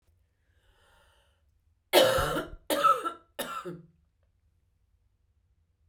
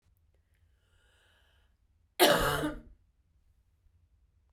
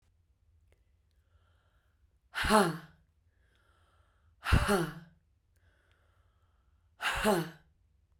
{
  "three_cough_length": "5.9 s",
  "three_cough_amplitude": 13880,
  "three_cough_signal_mean_std_ratio": 0.33,
  "cough_length": "4.5 s",
  "cough_amplitude": 10594,
  "cough_signal_mean_std_ratio": 0.27,
  "exhalation_length": "8.2 s",
  "exhalation_amplitude": 10345,
  "exhalation_signal_mean_std_ratio": 0.31,
  "survey_phase": "beta (2021-08-13 to 2022-03-07)",
  "age": "45-64",
  "gender": "Female",
  "wearing_mask": "No",
  "symptom_cough_any": true,
  "symptom_runny_or_blocked_nose": true,
  "symptom_sore_throat": true,
  "symptom_diarrhoea": true,
  "symptom_fatigue": true,
  "symptom_headache": true,
  "symptom_onset": "3 days",
  "smoker_status": "Never smoked",
  "respiratory_condition_asthma": false,
  "respiratory_condition_other": false,
  "recruitment_source": "Test and Trace",
  "submission_delay": "2 days",
  "covid_test_result": "Negative",
  "covid_test_method": "RT-qPCR"
}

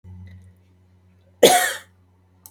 {
  "cough_length": "2.5 s",
  "cough_amplitude": 32768,
  "cough_signal_mean_std_ratio": 0.28,
  "survey_phase": "beta (2021-08-13 to 2022-03-07)",
  "age": "45-64",
  "gender": "Female",
  "wearing_mask": "No",
  "symptom_none": true,
  "smoker_status": "Never smoked",
  "respiratory_condition_asthma": false,
  "respiratory_condition_other": false,
  "recruitment_source": "REACT",
  "submission_delay": "1 day",
  "covid_test_result": "Negative",
  "covid_test_method": "RT-qPCR",
  "influenza_a_test_result": "Negative",
  "influenza_b_test_result": "Negative"
}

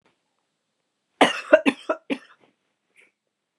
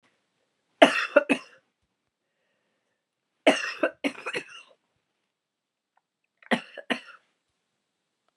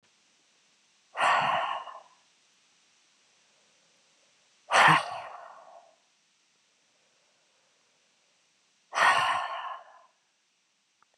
{
  "cough_length": "3.6 s",
  "cough_amplitude": 30553,
  "cough_signal_mean_std_ratio": 0.23,
  "three_cough_length": "8.4 s",
  "three_cough_amplitude": 29544,
  "three_cough_signal_mean_std_ratio": 0.23,
  "exhalation_length": "11.2 s",
  "exhalation_amplitude": 13308,
  "exhalation_signal_mean_std_ratio": 0.31,
  "survey_phase": "beta (2021-08-13 to 2022-03-07)",
  "age": "45-64",
  "gender": "Female",
  "wearing_mask": "No",
  "symptom_cough_any": true,
  "symptom_runny_or_blocked_nose": true,
  "symptom_fatigue": true,
  "symptom_headache": true,
  "smoker_status": "Never smoked",
  "respiratory_condition_asthma": false,
  "respiratory_condition_other": false,
  "recruitment_source": "Test and Trace",
  "submission_delay": "2 days",
  "covid_test_result": "Positive",
  "covid_test_method": "ePCR"
}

